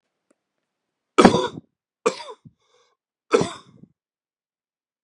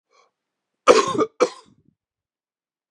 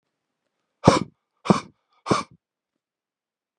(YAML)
three_cough_length: 5.0 s
three_cough_amplitude: 32767
three_cough_signal_mean_std_ratio: 0.22
cough_length: 2.9 s
cough_amplitude: 32767
cough_signal_mean_std_ratio: 0.27
exhalation_length: 3.6 s
exhalation_amplitude: 32767
exhalation_signal_mean_std_ratio: 0.22
survey_phase: beta (2021-08-13 to 2022-03-07)
age: 45-64
gender: Male
wearing_mask: 'No'
symptom_cough_any: true
symptom_runny_or_blocked_nose: true
symptom_sore_throat: true
symptom_fatigue: true
symptom_onset: 11 days
smoker_status: Never smoked
respiratory_condition_asthma: false
respiratory_condition_other: false
recruitment_source: REACT
submission_delay: 1 day
covid_test_result: Negative
covid_test_method: RT-qPCR
influenza_a_test_result: Unknown/Void
influenza_b_test_result: Unknown/Void